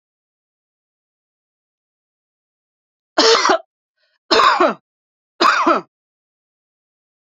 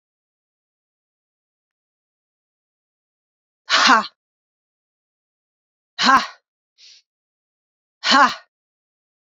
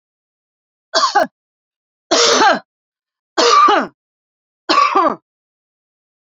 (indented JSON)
{
  "three_cough_length": "7.3 s",
  "three_cough_amplitude": 30235,
  "three_cough_signal_mean_std_ratio": 0.33,
  "exhalation_length": "9.4 s",
  "exhalation_amplitude": 29646,
  "exhalation_signal_mean_std_ratio": 0.23,
  "cough_length": "6.3 s",
  "cough_amplitude": 32767,
  "cough_signal_mean_std_ratio": 0.43,
  "survey_phase": "beta (2021-08-13 to 2022-03-07)",
  "age": "65+",
  "gender": "Female",
  "wearing_mask": "No",
  "symptom_runny_or_blocked_nose": true,
  "symptom_shortness_of_breath": true,
  "symptom_abdominal_pain": true,
  "symptom_fatigue": true,
  "symptom_headache": true,
  "symptom_other": true,
  "symptom_onset": "2 days",
  "smoker_status": "Never smoked",
  "respiratory_condition_asthma": false,
  "respiratory_condition_other": false,
  "recruitment_source": "REACT",
  "submission_delay": "1 day",
  "covid_test_result": "Negative",
  "covid_test_method": "RT-qPCR",
  "influenza_a_test_result": "Negative",
  "influenza_b_test_result": "Negative"
}